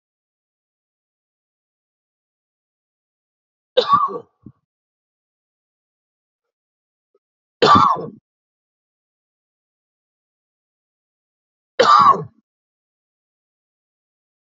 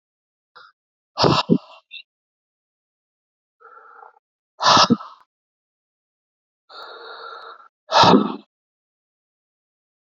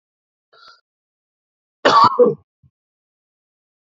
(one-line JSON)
{"three_cough_length": "14.5 s", "three_cough_amplitude": 28256, "three_cough_signal_mean_std_ratio": 0.22, "exhalation_length": "10.2 s", "exhalation_amplitude": 32069, "exhalation_signal_mean_std_ratio": 0.27, "cough_length": "3.8 s", "cough_amplitude": 29380, "cough_signal_mean_std_ratio": 0.27, "survey_phase": "beta (2021-08-13 to 2022-03-07)", "age": "45-64", "gender": "Male", "wearing_mask": "No", "symptom_cough_any": true, "symptom_runny_or_blocked_nose": true, "symptom_sore_throat": true, "symptom_headache": true, "smoker_status": "Never smoked", "respiratory_condition_asthma": false, "respiratory_condition_other": false, "recruitment_source": "Test and Trace", "submission_delay": "1 day", "covid_test_result": "Positive", "covid_test_method": "RT-qPCR", "covid_ct_value": 24.6, "covid_ct_gene": "ORF1ab gene", "covid_ct_mean": 24.9, "covid_viral_load": "6600 copies/ml", "covid_viral_load_category": "Minimal viral load (< 10K copies/ml)"}